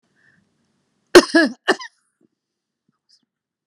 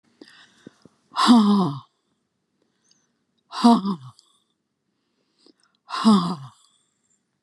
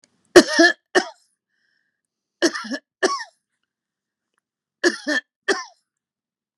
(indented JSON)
{
  "cough_length": "3.7 s",
  "cough_amplitude": 32768,
  "cough_signal_mean_std_ratio": 0.21,
  "exhalation_length": "7.4 s",
  "exhalation_amplitude": 23356,
  "exhalation_signal_mean_std_ratio": 0.34,
  "three_cough_length": "6.6 s",
  "three_cough_amplitude": 32768,
  "three_cough_signal_mean_std_ratio": 0.27,
  "survey_phase": "beta (2021-08-13 to 2022-03-07)",
  "age": "65+",
  "gender": "Female",
  "wearing_mask": "No",
  "symptom_cough_any": true,
  "smoker_status": "Never smoked",
  "respiratory_condition_asthma": false,
  "respiratory_condition_other": false,
  "recruitment_source": "REACT",
  "submission_delay": "3 days",
  "covid_test_result": "Negative",
  "covid_test_method": "RT-qPCR",
  "influenza_a_test_result": "Negative",
  "influenza_b_test_result": "Negative"
}